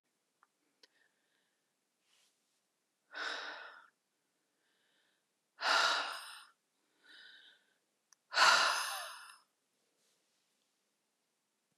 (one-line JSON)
{"exhalation_length": "11.8 s", "exhalation_amplitude": 6549, "exhalation_signal_mean_std_ratio": 0.28, "survey_phase": "beta (2021-08-13 to 2022-03-07)", "age": "45-64", "gender": "Female", "wearing_mask": "No", "symptom_cough_any": true, "symptom_new_continuous_cough": true, "symptom_runny_or_blocked_nose": true, "symptom_shortness_of_breath": true, "symptom_sore_throat": true, "symptom_abdominal_pain": true, "symptom_fatigue": true, "symptom_headache": true, "symptom_onset": "2 days", "smoker_status": "Never smoked", "respiratory_condition_asthma": false, "respiratory_condition_other": false, "recruitment_source": "Test and Trace", "submission_delay": "1 day", "covid_test_result": "Positive", "covid_test_method": "RT-qPCR", "covid_ct_value": 20.8, "covid_ct_gene": "ORF1ab gene"}